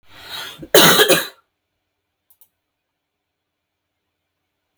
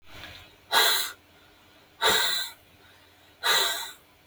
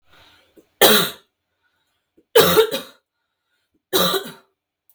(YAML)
cough_length: 4.8 s
cough_amplitude: 32768
cough_signal_mean_std_ratio: 0.27
exhalation_length: 4.3 s
exhalation_amplitude: 14188
exhalation_signal_mean_std_ratio: 0.48
three_cough_length: 4.9 s
three_cough_amplitude: 32768
three_cough_signal_mean_std_ratio: 0.34
survey_phase: beta (2021-08-13 to 2022-03-07)
age: 18-44
gender: Female
wearing_mask: 'No'
symptom_runny_or_blocked_nose: true
symptom_onset: 12 days
smoker_status: Ex-smoker
respiratory_condition_asthma: true
respiratory_condition_other: false
recruitment_source: REACT
submission_delay: 0 days
covid_test_result: Negative
covid_test_method: RT-qPCR